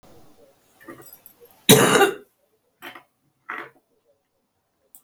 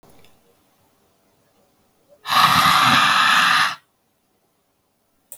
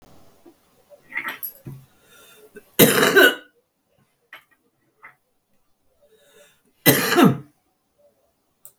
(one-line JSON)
{"cough_length": "5.0 s", "cough_amplitude": 32768, "cough_signal_mean_std_ratio": 0.25, "exhalation_length": "5.4 s", "exhalation_amplitude": 32242, "exhalation_signal_mean_std_ratio": 0.45, "three_cough_length": "8.8 s", "three_cough_amplitude": 32768, "three_cough_signal_mean_std_ratio": 0.29, "survey_phase": "beta (2021-08-13 to 2022-03-07)", "age": "65+", "gender": "Female", "wearing_mask": "No", "symptom_cough_any": true, "smoker_status": "Current smoker (11 or more cigarettes per day)", "respiratory_condition_asthma": false, "respiratory_condition_other": false, "recruitment_source": "REACT", "submission_delay": "1 day", "covid_test_result": "Negative", "covid_test_method": "RT-qPCR", "influenza_a_test_result": "Unknown/Void", "influenza_b_test_result": "Unknown/Void"}